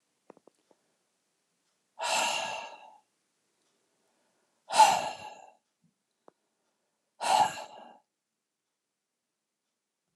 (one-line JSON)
{"exhalation_length": "10.2 s", "exhalation_amplitude": 14738, "exhalation_signal_mean_std_ratio": 0.26, "survey_phase": "alpha (2021-03-01 to 2021-08-12)", "age": "65+", "gender": "Male", "wearing_mask": "No", "symptom_none": true, "symptom_onset": "3 days", "smoker_status": "Never smoked", "respiratory_condition_asthma": false, "respiratory_condition_other": false, "recruitment_source": "REACT", "submission_delay": "2 days", "covid_test_result": "Negative", "covid_test_method": "RT-qPCR"}